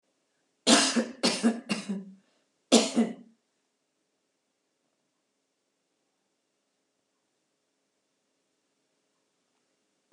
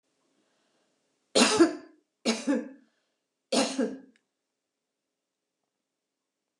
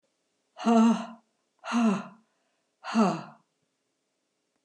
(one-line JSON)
{"cough_length": "10.1 s", "cough_amplitude": 17426, "cough_signal_mean_std_ratio": 0.26, "three_cough_length": "6.6 s", "three_cough_amplitude": 13562, "three_cough_signal_mean_std_ratio": 0.3, "exhalation_length": "4.6 s", "exhalation_amplitude": 9211, "exhalation_signal_mean_std_ratio": 0.4, "survey_phase": "beta (2021-08-13 to 2022-03-07)", "age": "65+", "gender": "Female", "wearing_mask": "No", "symptom_cough_any": true, "symptom_fatigue": true, "symptom_onset": "8 days", "smoker_status": "Never smoked", "respiratory_condition_asthma": false, "respiratory_condition_other": false, "recruitment_source": "REACT", "submission_delay": "2 days", "covid_test_result": "Negative", "covid_test_method": "RT-qPCR"}